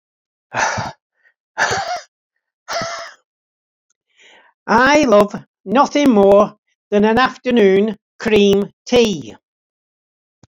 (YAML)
exhalation_length: 10.5 s
exhalation_amplitude: 32767
exhalation_signal_mean_std_ratio: 0.5
survey_phase: beta (2021-08-13 to 2022-03-07)
age: 65+
gender: Male
wearing_mask: 'No'
symptom_none: true
smoker_status: Ex-smoker
respiratory_condition_asthma: false
respiratory_condition_other: false
recruitment_source: REACT
submission_delay: 2 days
covid_test_result: Negative
covid_test_method: RT-qPCR
influenza_a_test_result: Negative
influenza_b_test_result: Negative